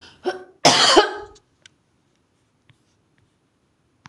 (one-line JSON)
{"cough_length": "4.1 s", "cough_amplitude": 26028, "cough_signal_mean_std_ratio": 0.29, "survey_phase": "beta (2021-08-13 to 2022-03-07)", "age": "65+", "gender": "Female", "wearing_mask": "No", "symptom_runny_or_blocked_nose": true, "symptom_fatigue": true, "smoker_status": "Ex-smoker", "respiratory_condition_asthma": false, "respiratory_condition_other": true, "recruitment_source": "REACT", "submission_delay": "1 day", "covid_test_result": "Negative", "covid_test_method": "RT-qPCR"}